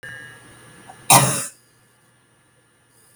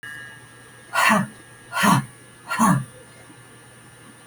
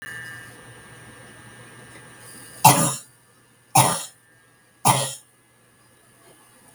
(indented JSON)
{
  "cough_length": "3.2 s",
  "cough_amplitude": 32768,
  "cough_signal_mean_std_ratio": 0.27,
  "exhalation_length": "4.3 s",
  "exhalation_amplitude": 21193,
  "exhalation_signal_mean_std_ratio": 0.45,
  "three_cough_length": "6.7 s",
  "three_cough_amplitude": 32768,
  "three_cough_signal_mean_std_ratio": 0.3,
  "survey_phase": "beta (2021-08-13 to 2022-03-07)",
  "age": "45-64",
  "gender": "Female",
  "wearing_mask": "No",
  "symptom_none": true,
  "smoker_status": "Ex-smoker",
  "respiratory_condition_asthma": false,
  "respiratory_condition_other": false,
  "recruitment_source": "REACT",
  "submission_delay": "6 days",
  "covid_test_result": "Negative",
  "covid_test_method": "RT-qPCR"
}